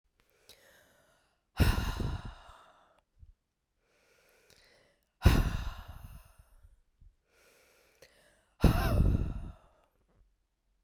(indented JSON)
{
  "exhalation_length": "10.8 s",
  "exhalation_amplitude": 11246,
  "exhalation_signal_mean_std_ratio": 0.32,
  "survey_phase": "beta (2021-08-13 to 2022-03-07)",
  "age": "45-64",
  "gender": "Female",
  "wearing_mask": "No",
  "symptom_cough_any": true,
  "symptom_runny_or_blocked_nose": true,
  "symptom_shortness_of_breath": true,
  "symptom_fatigue": true,
  "symptom_onset": "3 days",
  "smoker_status": "Never smoked",
  "respiratory_condition_asthma": true,
  "respiratory_condition_other": false,
  "recruitment_source": "Test and Trace",
  "submission_delay": "2 days",
  "covid_test_result": "Positive",
  "covid_test_method": "RT-qPCR"
}